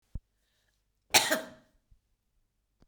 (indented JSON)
{
  "cough_length": "2.9 s",
  "cough_amplitude": 15674,
  "cough_signal_mean_std_ratio": 0.22,
  "survey_phase": "beta (2021-08-13 to 2022-03-07)",
  "age": "65+",
  "gender": "Female",
  "wearing_mask": "No",
  "symptom_cough_any": true,
  "smoker_status": "Never smoked",
  "respiratory_condition_asthma": false,
  "respiratory_condition_other": false,
  "recruitment_source": "REACT",
  "submission_delay": "1 day",
  "covid_test_result": "Negative",
  "covid_test_method": "RT-qPCR",
  "influenza_a_test_result": "Negative",
  "influenza_b_test_result": "Negative"
}